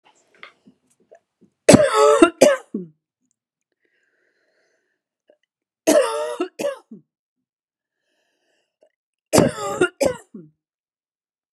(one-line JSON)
{"three_cough_length": "11.5 s", "three_cough_amplitude": 32768, "three_cough_signal_mean_std_ratio": 0.29, "survey_phase": "beta (2021-08-13 to 2022-03-07)", "age": "45-64", "gender": "Female", "wearing_mask": "No", "symptom_runny_or_blocked_nose": true, "symptom_headache": true, "symptom_change_to_sense_of_smell_or_taste": true, "symptom_loss_of_taste": true, "symptom_onset": "3 days", "smoker_status": "Never smoked", "respiratory_condition_asthma": false, "respiratory_condition_other": false, "recruitment_source": "Test and Trace", "submission_delay": "2 days", "covid_test_result": "Positive", "covid_test_method": "RT-qPCR"}